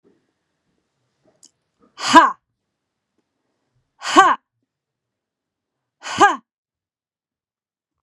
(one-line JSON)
{"exhalation_length": "8.0 s", "exhalation_amplitude": 32768, "exhalation_signal_mean_std_ratio": 0.22, "survey_phase": "beta (2021-08-13 to 2022-03-07)", "age": "45-64", "gender": "Female", "wearing_mask": "No", "symptom_runny_or_blocked_nose": true, "smoker_status": "Never smoked", "respiratory_condition_asthma": false, "respiratory_condition_other": false, "recruitment_source": "REACT", "submission_delay": "2 days", "covid_test_result": "Negative", "covid_test_method": "RT-qPCR"}